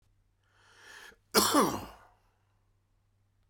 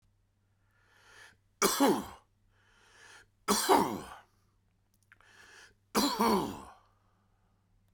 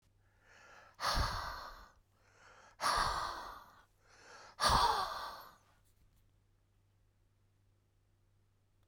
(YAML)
cough_length: 3.5 s
cough_amplitude: 11475
cough_signal_mean_std_ratio: 0.29
three_cough_length: 7.9 s
three_cough_amplitude: 9423
three_cough_signal_mean_std_ratio: 0.35
exhalation_length: 8.9 s
exhalation_amplitude: 4760
exhalation_signal_mean_std_ratio: 0.39
survey_phase: alpha (2021-03-01 to 2021-08-12)
age: 45-64
gender: Male
wearing_mask: 'No'
symptom_headache: true
symptom_change_to_sense_of_smell_or_taste: true
symptom_loss_of_taste: true
symptom_onset: 3 days
smoker_status: Current smoker (11 or more cigarettes per day)
respiratory_condition_asthma: false
respiratory_condition_other: false
recruitment_source: Test and Trace
submission_delay: 2 days
covid_test_result: Positive
covid_test_method: RT-qPCR
covid_ct_value: 14.8
covid_ct_gene: ORF1ab gene
covid_ct_mean: 15.1
covid_viral_load: 11000000 copies/ml
covid_viral_load_category: High viral load (>1M copies/ml)